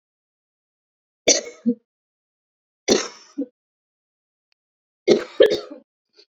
{"three_cough_length": "6.3 s", "three_cough_amplitude": 31257, "three_cough_signal_mean_std_ratio": 0.26, "survey_phase": "beta (2021-08-13 to 2022-03-07)", "age": "18-44", "gender": "Female", "wearing_mask": "No", "symptom_cough_any": true, "symptom_runny_or_blocked_nose": true, "symptom_shortness_of_breath": true, "symptom_fever_high_temperature": true, "symptom_headache": true, "smoker_status": "Ex-smoker", "respiratory_condition_asthma": false, "respiratory_condition_other": false, "recruitment_source": "Test and Trace", "submission_delay": "3 days", "covid_test_result": "Positive", "covid_test_method": "RT-qPCR", "covid_ct_value": 26.0, "covid_ct_gene": "ORF1ab gene"}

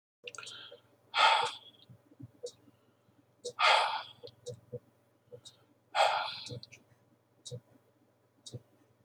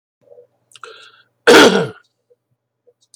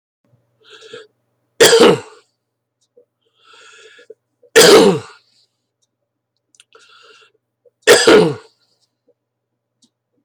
{"exhalation_length": "9.0 s", "exhalation_amplitude": 8052, "exhalation_signal_mean_std_ratio": 0.33, "cough_length": "3.2 s", "cough_amplitude": 32768, "cough_signal_mean_std_ratio": 0.3, "three_cough_length": "10.2 s", "three_cough_amplitude": 32768, "three_cough_signal_mean_std_ratio": 0.3, "survey_phase": "beta (2021-08-13 to 2022-03-07)", "age": "45-64", "gender": "Male", "wearing_mask": "No", "symptom_none": true, "smoker_status": "Ex-smoker", "respiratory_condition_asthma": false, "respiratory_condition_other": false, "recruitment_source": "REACT", "submission_delay": "1 day", "covid_test_result": "Negative", "covid_test_method": "RT-qPCR"}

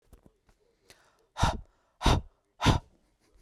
{"exhalation_length": "3.4 s", "exhalation_amplitude": 12116, "exhalation_signal_mean_std_ratio": 0.31, "survey_phase": "beta (2021-08-13 to 2022-03-07)", "age": "18-44", "gender": "Male", "wearing_mask": "No", "symptom_none": true, "smoker_status": "Never smoked", "respiratory_condition_asthma": false, "respiratory_condition_other": false, "recruitment_source": "REACT", "submission_delay": "3 days", "covid_test_result": "Negative", "covid_test_method": "RT-qPCR"}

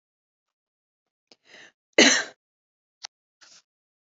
{"cough_length": "4.2 s", "cough_amplitude": 27409, "cough_signal_mean_std_ratio": 0.19, "survey_phase": "beta (2021-08-13 to 2022-03-07)", "age": "18-44", "gender": "Female", "wearing_mask": "No", "symptom_none": true, "smoker_status": "Never smoked", "respiratory_condition_asthma": false, "respiratory_condition_other": false, "recruitment_source": "REACT", "submission_delay": "1 day", "covid_test_result": "Negative", "covid_test_method": "RT-qPCR"}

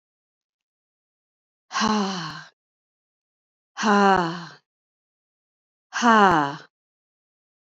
{"exhalation_length": "7.8 s", "exhalation_amplitude": 24512, "exhalation_signal_mean_std_ratio": 0.34, "survey_phase": "beta (2021-08-13 to 2022-03-07)", "age": "45-64", "gender": "Female", "wearing_mask": "No", "symptom_none": true, "smoker_status": "Never smoked", "respiratory_condition_asthma": false, "respiratory_condition_other": false, "recruitment_source": "REACT", "submission_delay": "2 days", "covid_test_result": "Negative", "covid_test_method": "RT-qPCR", "influenza_a_test_result": "Negative", "influenza_b_test_result": "Negative"}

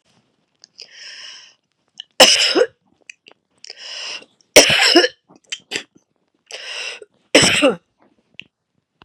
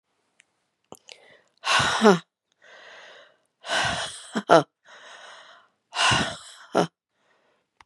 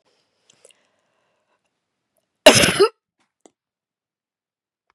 {"three_cough_length": "9.0 s", "three_cough_amplitude": 32768, "three_cough_signal_mean_std_ratio": 0.33, "exhalation_length": "7.9 s", "exhalation_amplitude": 32767, "exhalation_signal_mean_std_ratio": 0.33, "cough_length": "4.9 s", "cough_amplitude": 32768, "cough_signal_mean_std_ratio": 0.2, "survey_phase": "beta (2021-08-13 to 2022-03-07)", "age": "45-64", "gender": "Female", "wearing_mask": "No", "symptom_cough_any": true, "symptom_shortness_of_breath": true, "symptom_abdominal_pain": true, "symptom_diarrhoea": true, "symptom_fatigue": true, "symptom_fever_high_temperature": true, "symptom_headache": true, "symptom_other": true, "symptom_onset": "4 days", "smoker_status": "Never smoked", "respiratory_condition_asthma": true, "respiratory_condition_other": false, "recruitment_source": "Test and Trace", "submission_delay": "2 days", "covid_test_result": "Positive", "covid_test_method": "ePCR"}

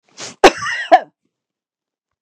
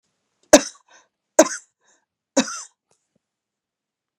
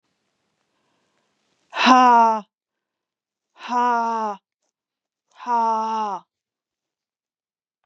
{"cough_length": "2.2 s", "cough_amplitude": 32768, "cough_signal_mean_std_ratio": 0.28, "three_cough_length": "4.2 s", "three_cough_amplitude": 32768, "three_cough_signal_mean_std_ratio": 0.18, "exhalation_length": "7.9 s", "exhalation_amplitude": 30751, "exhalation_signal_mean_std_ratio": 0.38, "survey_phase": "beta (2021-08-13 to 2022-03-07)", "age": "45-64", "gender": "Female", "wearing_mask": "No", "symptom_none": true, "smoker_status": "Never smoked", "respiratory_condition_asthma": false, "respiratory_condition_other": false, "recruitment_source": "REACT", "submission_delay": "4 days", "covid_test_result": "Negative", "covid_test_method": "RT-qPCR", "influenza_a_test_result": "Unknown/Void", "influenza_b_test_result": "Unknown/Void"}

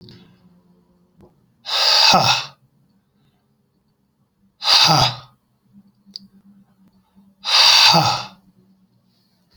{"exhalation_length": "9.6 s", "exhalation_amplitude": 32061, "exhalation_signal_mean_std_ratio": 0.38, "survey_phase": "alpha (2021-03-01 to 2021-08-12)", "age": "45-64", "gender": "Male", "wearing_mask": "No", "symptom_none": true, "smoker_status": "Ex-smoker", "respiratory_condition_asthma": false, "respiratory_condition_other": false, "recruitment_source": "REACT", "submission_delay": "2 days", "covid_test_result": "Negative", "covid_test_method": "RT-qPCR"}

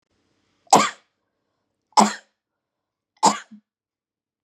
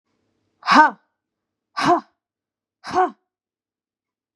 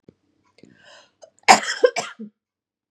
{"three_cough_length": "4.4 s", "three_cough_amplitude": 32054, "three_cough_signal_mean_std_ratio": 0.23, "exhalation_length": "4.4 s", "exhalation_amplitude": 32621, "exhalation_signal_mean_std_ratio": 0.29, "cough_length": "2.9 s", "cough_amplitude": 32768, "cough_signal_mean_std_ratio": 0.24, "survey_phase": "beta (2021-08-13 to 2022-03-07)", "age": "45-64", "gender": "Female", "wearing_mask": "No", "symptom_cough_any": true, "smoker_status": "Never smoked", "respiratory_condition_asthma": false, "respiratory_condition_other": false, "recruitment_source": "REACT", "submission_delay": "1 day", "covid_test_result": "Negative", "covid_test_method": "RT-qPCR", "influenza_a_test_result": "Unknown/Void", "influenza_b_test_result": "Unknown/Void"}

